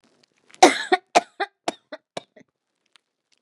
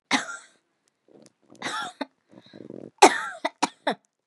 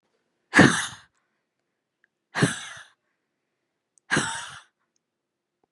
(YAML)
three_cough_length: 3.4 s
three_cough_amplitude: 32699
three_cough_signal_mean_std_ratio: 0.22
cough_length: 4.3 s
cough_amplitude: 32674
cough_signal_mean_std_ratio: 0.27
exhalation_length: 5.7 s
exhalation_amplitude: 27218
exhalation_signal_mean_std_ratio: 0.25
survey_phase: beta (2021-08-13 to 2022-03-07)
age: 18-44
gender: Female
wearing_mask: 'No'
symptom_cough_any: true
symptom_sore_throat: true
symptom_fever_high_temperature: true
symptom_headache: true
symptom_change_to_sense_of_smell_or_taste: true
symptom_loss_of_taste: true
symptom_onset: 2 days
smoker_status: Never smoked
respiratory_condition_asthma: false
respiratory_condition_other: false
recruitment_source: Test and Trace
submission_delay: 2 days
covid_test_result: Positive
covid_test_method: RT-qPCR
covid_ct_value: 31.2
covid_ct_gene: ORF1ab gene